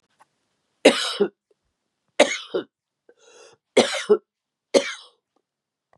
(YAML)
three_cough_length: 6.0 s
three_cough_amplitude: 31506
three_cough_signal_mean_std_ratio: 0.28
survey_phase: beta (2021-08-13 to 2022-03-07)
age: 65+
gender: Female
wearing_mask: 'No'
symptom_none: true
smoker_status: Ex-smoker
respiratory_condition_asthma: false
respiratory_condition_other: false
recruitment_source: REACT
submission_delay: 3 days
covid_test_result: Negative
covid_test_method: RT-qPCR
influenza_a_test_result: Negative
influenza_b_test_result: Negative